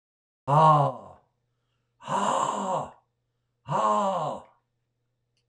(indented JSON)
{
  "exhalation_length": "5.5 s",
  "exhalation_amplitude": 13792,
  "exhalation_signal_mean_std_ratio": 0.47,
  "survey_phase": "alpha (2021-03-01 to 2021-08-12)",
  "age": "65+",
  "gender": "Male",
  "wearing_mask": "No",
  "symptom_cough_any": true,
  "symptom_fatigue": true,
  "symptom_onset": "6 days",
  "smoker_status": "Never smoked",
  "respiratory_condition_asthma": false,
  "respiratory_condition_other": false,
  "recruitment_source": "REACT",
  "submission_delay": "1 day",
  "covid_test_result": "Negative",
  "covid_test_method": "RT-qPCR"
}